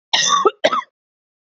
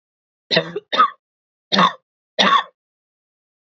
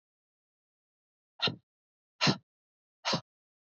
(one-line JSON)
{"cough_length": "1.5 s", "cough_amplitude": 27920, "cough_signal_mean_std_ratio": 0.48, "three_cough_length": "3.7 s", "three_cough_amplitude": 32692, "three_cough_signal_mean_std_ratio": 0.36, "exhalation_length": "3.7 s", "exhalation_amplitude": 7807, "exhalation_signal_mean_std_ratio": 0.25, "survey_phase": "beta (2021-08-13 to 2022-03-07)", "age": "45-64", "gender": "Female", "wearing_mask": "No", "symptom_none": true, "smoker_status": "Never smoked", "respiratory_condition_asthma": false, "respiratory_condition_other": false, "recruitment_source": "REACT", "submission_delay": "0 days", "covid_test_result": "Negative", "covid_test_method": "RT-qPCR", "influenza_a_test_result": "Negative", "influenza_b_test_result": "Negative"}